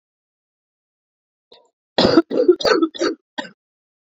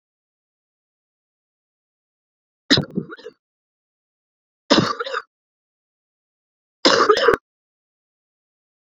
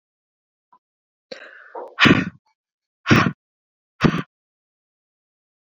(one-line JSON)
{"cough_length": "4.1 s", "cough_amplitude": 32767, "cough_signal_mean_std_ratio": 0.36, "three_cough_length": "9.0 s", "three_cough_amplitude": 32062, "three_cough_signal_mean_std_ratio": 0.25, "exhalation_length": "5.6 s", "exhalation_amplitude": 30038, "exhalation_signal_mean_std_ratio": 0.27, "survey_phase": "beta (2021-08-13 to 2022-03-07)", "age": "18-44", "gender": "Female", "wearing_mask": "No", "symptom_cough_any": true, "symptom_runny_or_blocked_nose": true, "symptom_fatigue": true, "symptom_headache": true, "symptom_onset": "4 days", "smoker_status": "Never smoked", "respiratory_condition_asthma": false, "respiratory_condition_other": false, "recruitment_source": "Test and Trace", "submission_delay": "1 day", "covid_test_result": "Positive", "covid_test_method": "RT-qPCR"}